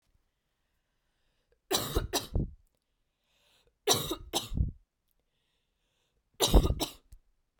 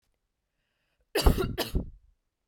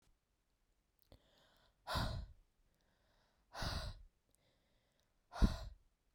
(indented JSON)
{
  "three_cough_length": "7.6 s",
  "three_cough_amplitude": 14105,
  "three_cough_signal_mean_std_ratio": 0.32,
  "cough_length": "2.5 s",
  "cough_amplitude": 17728,
  "cough_signal_mean_std_ratio": 0.32,
  "exhalation_length": "6.1 s",
  "exhalation_amplitude": 3631,
  "exhalation_signal_mean_std_ratio": 0.29,
  "survey_phase": "beta (2021-08-13 to 2022-03-07)",
  "age": "18-44",
  "gender": "Female",
  "wearing_mask": "No",
  "symptom_sore_throat": true,
  "symptom_onset": "9 days",
  "smoker_status": "Never smoked",
  "respiratory_condition_asthma": false,
  "respiratory_condition_other": false,
  "recruitment_source": "REACT",
  "submission_delay": "2 days",
  "covid_test_result": "Negative",
  "covid_test_method": "RT-qPCR"
}